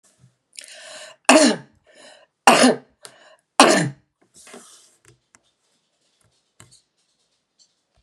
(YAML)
three_cough_length: 8.0 s
three_cough_amplitude: 32768
three_cough_signal_mean_std_ratio: 0.26
survey_phase: beta (2021-08-13 to 2022-03-07)
age: 65+
gender: Female
wearing_mask: 'No'
symptom_none: true
symptom_onset: 5 days
smoker_status: Ex-smoker
respiratory_condition_asthma: false
respiratory_condition_other: false
recruitment_source: Test and Trace
submission_delay: 1 day
covid_test_result: Positive
covid_test_method: RT-qPCR
covid_ct_value: 18.2
covid_ct_gene: ORF1ab gene
covid_ct_mean: 18.5
covid_viral_load: 890000 copies/ml
covid_viral_load_category: Low viral load (10K-1M copies/ml)